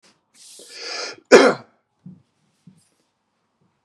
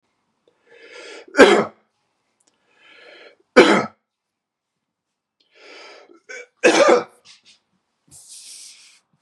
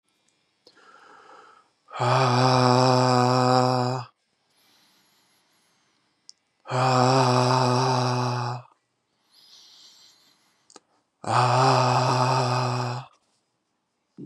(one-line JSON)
{"cough_length": "3.8 s", "cough_amplitude": 32768, "cough_signal_mean_std_ratio": 0.23, "three_cough_length": "9.2 s", "three_cough_amplitude": 32768, "three_cough_signal_mean_std_ratio": 0.26, "exhalation_length": "14.3 s", "exhalation_amplitude": 22175, "exhalation_signal_mean_std_ratio": 0.49, "survey_phase": "beta (2021-08-13 to 2022-03-07)", "age": "45-64", "gender": "Male", "wearing_mask": "No", "symptom_cough_any": true, "symptom_shortness_of_breath": true, "symptom_onset": "13 days", "smoker_status": "Never smoked", "respiratory_condition_asthma": false, "respiratory_condition_other": false, "recruitment_source": "REACT", "submission_delay": "3 days", "covid_test_result": "Negative", "covid_test_method": "RT-qPCR", "influenza_a_test_result": "Negative", "influenza_b_test_result": "Negative"}